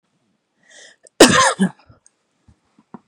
{
  "cough_length": "3.1 s",
  "cough_amplitude": 32768,
  "cough_signal_mean_std_ratio": 0.28,
  "survey_phase": "beta (2021-08-13 to 2022-03-07)",
  "age": "45-64",
  "gender": "Female",
  "wearing_mask": "No",
  "symptom_shortness_of_breath": true,
  "symptom_fatigue": true,
  "symptom_onset": "12 days",
  "smoker_status": "Never smoked",
  "respiratory_condition_asthma": true,
  "respiratory_condition_other": false,
  "recruitment_source": "REACT",
  "submission_delay": "2 days",
  "covid_test_result": "Negative",
  "covid_test_method": "RT-qPCR",
  "influenza_a_test_result": "Negative",
  "influenza_b_test_result": "Negative"
}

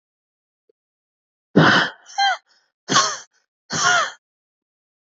{
  "exhalation_length": "5.0 s",
  "exhalation_amplitude": 28267,
  "exhalation_signal_mean_std_ratio": 0.37,
  "survey_phase": "beta (2021-08-13 to 2022-03-07)",
  "age": "18-44",
  "gender": "Female",
  "wearing_mask": "No",
  "symptom_new_continuous_cough": true,
  "symptom_shortness_of_breath": true,
  "symptom_fatigue": true,
  "symptom_headache": true,
  "symptom_change_to_sense_of_smell_or_taste": true,
  "symptom_loss_of_taste": true,
  "symptom_onset": "4 days",
  "smoker_status": "Never smoked",
  "respiratory_condition_asthma": true,
  "respiratory_condition_other": false,
  "recruitment_source": "Test and Trace",
  "submission_delay": "2 days",
  "covid_test_result": "Positive",
  "covid_test_method": "RT-qPCR",
  "covid_ct_value": 18.9,
  "covid_ct_gene": "ORF1ab gene",
  "covid_ct_mean": 19.6,
  "covid_viral_load": "380000 copies/ml",
  "covid_viral_load_category": "Low viral load (10K-1M copies/ml)"
}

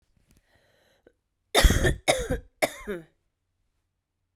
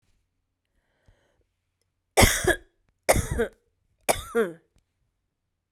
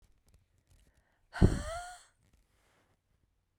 {
  "cough_length": "4.4 s",
  "cough_amplitude": 18340,
  "cough_signal_mean_std_ratio": 0.31,
  "three_cough_length": "5.7 s",
  "three_cough_amplitude": 24505,
  "three_cough_signal_mean_std_ratio": 0.29,
  "exhalation_length": "3.6 s",
  "exhalation_amplitude": 12154,
  "exhalation_signal_mean_std_ratio": 0.21,
  "survey_phase": "beta (2021-08-13 to 2022-03-07)",
  "age": "45-64",
  "gender": "Female",
  "wearing_mask": "No",
  "symptom_runny_or_blocked_nose": true,
  "symptom_shortness_of_breath": true,
  "symptom_sore_throat": true,
  "symptom_fatigue": true,
  "smoker_status": "Never smoked",
  "respiratory_condition_asthma": false,
  "respiratory_condition_other": false,
  "recruitment_source": "Test and Trace",
  "submission_delay": "2 days",
  "covid_test_result": "Positive",
  "covid_test_method": "RT-qPCR"
}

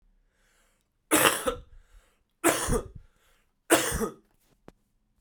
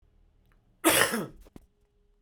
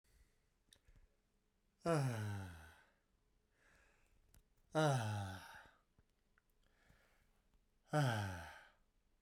{
  "three_cough_length": "5.2 s",
  "three_cough_amplitude": 28847,
  "three_cough_signal_mean_std_ratio": 0.36,
  "cough_length": "2.2 s",
  "cough_amplitude": 22150,
  "cough_signal_mean_std_ratio": 0.34,
  "exhalation_length": "9.2 s",
  "exhalation_amplitude": 2023,
  "exhalation_signal_mean_std_ratio": 0.38,
  "survey_phase": "beta (2021-08-13 to 2022-03-07)",
  "age": "45-64",
  "gender": "Male",
  "wearing_mask": "No",
  "symptom_cough_any": true,
  "symptom_runny_or_blocked_nose": true,
  "symptom_shortness_of_breath": true,
  "symptom_fatigue": true,
  "symptom_headache": true,
  "symptom_other": true,
  "smoker_status": "Never smoked",
  "respiratory_condition_asthma": false,
  "respiratory_condition_other": false,
  "recruitment_source": "Test and Trace",
  "submission_delay": "2 days",
  "covid_test_result": "Positive",
  "covid_test_method": "RT-qPCR"
}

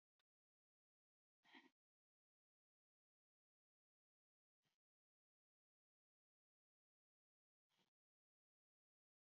{
  "exhalation_length": "9.2 s",
  "exhalation_amplitude": 78,
  "exhalation_signal_mean_std_ratio": 0.12,
  "survey_phase": "beta (2021-08-13 to 2022-03-07)",
  "age": "18-44",
  "gender": "Female",
  "wearing_mask": "No",
  "symptom_none": true,
  "smoker_status": "Never smoked",
  "respiratory_condition_asthma": false,
  "respiratory_condition_other": false,
  "recruitment_source": "REACT",
  "submission_delay": "6 days",
  "covid_test_result": "Negative",
  "covid_test_method": "RT-qPCR",
  "influenza_a_test_result": "Negative",
  "influenza_b_test_result": "Negative"
}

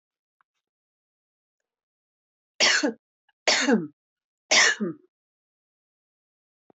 {
  "three_cough_length": "6.7 s",
  "three_cough_amplitude": 18076,
  "three_cough_signal_mean_std_ratio": 0.31,
  "survey_phase": "beta (2021-08-13 to 2022-03-07)",
  "age": "45-64",
  "gender": "Female",
  "wearing_mask": "No",
  "symptom_none": true,
  "smoker_status": "Never smoked",
  "respiratory_condition_asthma": true,
  "respiratory_condition_other": true,
  "recruitment_source": "REACT",
  "submission_delay": "1 day",
  "covid_test_result": "Negative",
  "covid_test_method": "RT-qPCR",
  "influenza_a_test_result": "Negative",
  "influenza_b_test_result": "Negative"
}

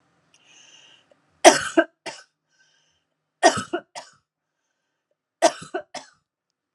{
  "three_cough_length": "6.7 s",
  "three_cough_amplitude": 32768,
  "three_cough_signal_mean_std_ratio": 0.21,
  "survey_phase": "beta (2021-08-13 to 2022-03-07)",
  "age": "45-64",
  "gender": "Female",
  "wearing_mask": "No",
  "symptom_shortness_of_breath": true,
  "symptom_fatigue": true,
  "smoker_status": "Never smoked",
  "respiratory_condition_asthma": false,
  "respiratory_condition_other": false,
  "recruitment_source": "REACT",
  "submission_delay": "1 day",
  "covid_test_result": "Negative",
  "covid_test_method": "RT-qPCR",
  "influenza_a_test_result": "Negative",
  "influenza_b_test_result": "Negative"
}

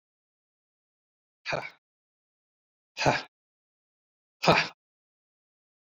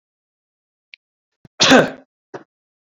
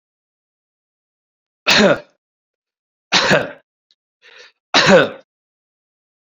{
  "exhalation_length": "5.8 s",
  "exhalation_amplitude": 15870,
  "exhalation_signal_mean_std_ratio": 0.22,
  "cough_length": "2.9 s",
  "cough_amplitude": 32719,
  "cough_signal_mean_std_ratio": 0.25,
  "three_cough_length": "6.3 s",
  "three_cough_amplitude": 32767,
  "three_cough_signal_mean_std_ratio": 0.32,
  "survey_phase": "beta (2021-08-13 to 2022-03-07)",
  "age": "45-64",
  "gender": "Male",
  "wearing_mask": "No",
  "symptom_none": true,
  "smoker_status": "Ex-smoker",
  "respiratory_condition_asthma": false,
  "respiratory_condition_other": false,
  "recruitment_source": "REACT",
  "submission_delay": "3 days",
  "covid_test_result": "Negative",
  "covid_test_method": "RT-qPCR"
}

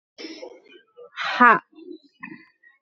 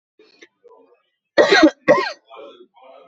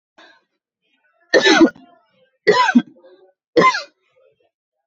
{
  "exhalation_length": "2.8 s",
  "exhalation_amplitude": 28066,
  "exhalation_signal_mean_std_ratio": 0.28,
  "cough_length": "3.1 s",
  "cough_amplitude": 27806,
  "cough_signal_mean_std_ratio": 0.34,
  "three_cough_length": "4.9 s",
  "three_cough_amplitude": 30869,
  "three_cough_signal_mean_std_ratio": 0.35,
  "survey_phase": "beta (2021-08-13 to 2022-03-07)",
  "age": "18-44",
  "gender": "Female",
  "wearing_mask": "No",
  "symptom_none": true,
  "smoker_status": "Never smoked",
  "respiratory_condition_asthma": false,
  "respiratory_condition_other": false,
  "recruitment_source": "REACT",
  "submission_delay": "2 days",
  "covid_test_result": "Negative",
  "covid_test_method": "RT-qPCR",
  "influenza_a_test_result": "Negative",
  "influenza_b_test_result": "Negative"
}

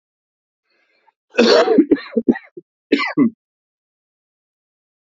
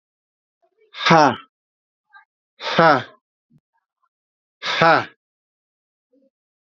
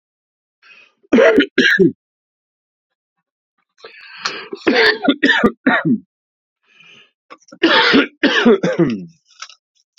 {
  "cough_length": "5.1 s",
  "cough_amplitude": 28488,
  "cough_signal_mean_std_ratio": 0.35,
  "exhalation_length": "6.7 s",
  "exhalation_amplitude": 28730,
  "exhalation_signal_mean_std_ratio": 0.29,
  "three_cough_length": "10.0 s",
  "three_cough_amplitude": 30834,
  "three_cough_signal_mean_std_ratio": 0.45,
  "survey_phase": "beta (2021-08-13 to 2022-03-07)",
  "age": "45-64",
  "gender": "Male",
  "wearing_mask": "Yes",
  "symptom_cough_any": true,
  "symptom_runny_or_blocked_nose": true,
  "symptom_shortness_of_breath": true,
  "symptom_fatigue": true,
  "symptom_headache": true,
  "symptom_onset": "6 days",
  "smoker_status": "Ex-smoker",
  "respiratory_condition_asthma": false,
  "respiratory_condition_other": false,
  "recruitment_source": "Test and Trace",
  "submission_delay": "1 day",
  "covid_test_result": "Positive",
  "covid_test_method": "RT-qPCR"
}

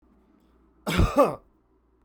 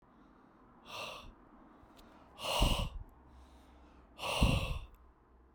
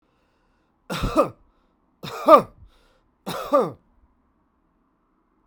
{
  "cough_length": "2.0 s",
  "cough_amplitude": 15941,
  "cough_signal_mean_std_ratio": 0.35,
  "exhalation_length": "5.5 s",
  "exhalation_amplitude": 5654,
  "exhalation_signal_mean_std_ratio": 0.42,
  "three_cough_length": "5.5 s",
  "three_cough_amplitude": 32767,
  "three_cough_signal_mean_std_ratio": 0.26,
  "survey_phase": "beta (2021-08-13 to 2022-03-07)",
  "age": "45-64",
  "gender": "Male",
  "wearing_mask": "No",
  "symptom_runny_or_blocked_nose": true,
  "symptom_abdominal_pain": true,
  "symptom_fatigue": true,
  "smoker_status": "Never smoked",
  "respiratory_condition_asthma": false,
  "respiratory_condition_other": true,
  "recruitment_source": "REACT",
  "submission_delay": "2 days",
  "covid_test_result": "Negative",
  "covid_test_method": "RT-qPCR"
}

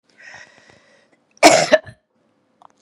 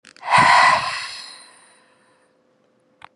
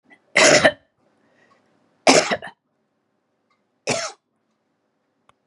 {
  "cough_length": "2.8 s",
  "cough_amplitude": 32768,
  "cough_signal_mean_std_ratio": 0.26,
  "exhalation_length": "3.2 s",
  "exhalation_amplitude": 27413,
  "exhalation_signal_mean_std_ratio": 0.4,
  "three_cough_length": "5.5 s",
  "three_cough_amplitude": 32768,
  "three_cough_signal_mean_std_ratio": 0.29,
  "survey_phase": "beta (2021-08-13 to 2022-03-07)",
  "age": "45-64",
  "gender": "Female",
  "wearing_mask": "No",
  "symptom_runny_or_blocked_nose": true,
  "symptom_sore_throat": true,
  "symptom_fatigue": true,
  "symptom_headache": true,
  "symptom_onset": "12 days",
  "smoker_status": "Ex-smoker",
  "respiratory_condition_asthma": false,
  "respiratory_condition_other": false,
  "recruitment_source": "REACT",
  "submission_delay": "2 days",
  "covid_test_result": "Positive",
  "covid_test_method": "RT-qPCR",
  "covid_ct_value": 17.0,
  "covid_ct_gene": "E gene",
  "influenza_a_test_result": "Negative",
  "influenza_b_test_result": "Negative"
}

